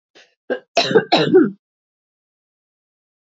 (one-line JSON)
{"cough_length": "3.3 s", "cough_amplitude": 27821, "cough_signal_mean_std_ratio": 0.35, "survey_phase": "beta (2021-08-13 to 2022-03-07)", "age": "18-44", "gender": "Female", "wearing_mask": "No", "symptom_cough_any": true, "symptom_runny_or_blocked_nose": true, "symptom_onset": "7 days", "smoker_status": "Never smoked", "respiratory_condition_asthma": false, "respiratory_condition_other": false, "recruitment_source": "Test and Trace", "submission_delay": "2 days", "covid_test_result": "Negative", "covid_test_method": "RT-qPCR"}